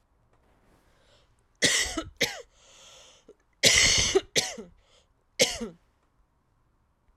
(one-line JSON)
{"three_cough_length": "7.2 s", "three_cough_amplitude": 19061, "three_cough_signal_mean_std_ratio": 0.35, "survey_phase": "alpha (2021-03-01 to 2021-08-12)", "age": "18-44", "gender": "Female", "wearing_mask": "No", "symptom_fatigue": true, "symptom_fever_high_temperature": true, "symptom_headache": true, "symptom_change_to_sense_of_smell_or_taste": true, "symptom_loss_of_taste": true, "symptom_onset": "5 days", "smoker_status": "Never smoked", "respiratory_condition_asthma": false, "respiratory_condition_other": false, "recruitment_source": "Test and Trace", "submission_delay": "2 days", "covid_test_result": "Positive", "covid_test_method": "RT-qPCR"}